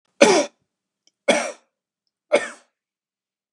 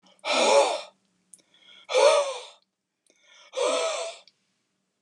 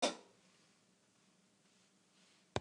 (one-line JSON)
{"three_cough_length": "3.5 s", "three_cough_amplitude": 32768, "three_cough_signal_mean_std_ratio": 0.29, "exhalation_length": "5.0 s", "exhalation_amplitude": 14799, "exhalation_signal_mean_std_ratio": 0.45, "cough_length": "2.6 s", "cough_amplitude": 3888, "cough_signal_mean_std_ratio": 0.21, "survey_phase": "beta (2021-08-13 to 2022-03-07)", "age": "65+", "gender": "Male", "wearing_mask": "No", "symptom_none": true, "smoker_status": "Never smoked", "respiratory_condition_asthma": false, "respiratory_condition_other": false, "recruitment_source": "REACT", "submission_delay": "1 day", "covid_test_result": "Negative", "covid_test_method": "RT-qPCR"}